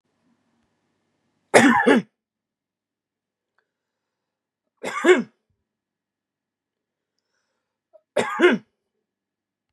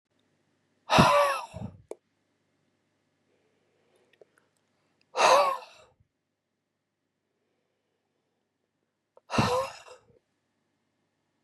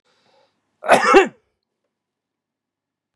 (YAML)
three_cough_length: 9.7 s
three_cough_amplitude: 32768
three_cough_signal_mean_std_ratio: 0.25
exhalation_length: 11.4 s
exhalation_amplitude: 16678
exhalation_signal_mean_std_ratio: 0.26
cough_length: 3.2 s
cough_amplitude: 32767
cough_signal_mean_std_ratio: 0.26
survey_phase: beta (2021-08-13 to 2022-03-07)
age: 65+
gender: Male
wearing_mask: 'No'
symptom_shortness_of_breath: true
symptom_fatigue: true
symptom_onset: 2 days
smoker_status: Never smoked
respiratory_condition_asthma: true
respiratory_condition_other: false
recruitment_source: Test and Trace
submission_delay: 2 days
covid_test_result: Positive
covid_test_method: RT-qPCR
covid_ct_value: 25.4
covid_ct_gene: ORF1ab gene
covid_ct_mean: 26.6
covid_viral_load: 1900 copies/ml
covid_viral_load_category: Minimal viral load (< 10K copies/ml)